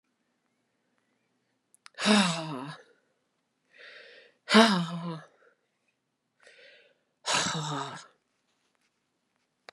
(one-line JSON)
{"exhalation_length": "9.7 s", "exhalation_amplitude": 22487, "exhalation_signal_mean_std_ratio": 0.3, "survey_phase": "beta (2021-08-13 to 2022-03-07)", "age": "45-64", "gender": "Female", "wearing_mask": "No", "symptom_cough_any": true, "symptom_runny_or_blocked_nose": true, "symptom_fatigue": true, "symptom_onset": "3 days", "smoker_status": "Ex-smoker", "respiratory_condition_asthma": false, "respiratory_condition_other": false, "recruitment_source": "Test and Trace", "submission_delay": "2 days", "covid_test_result": "Positive", "covid_test_method": "RT-qPCR"}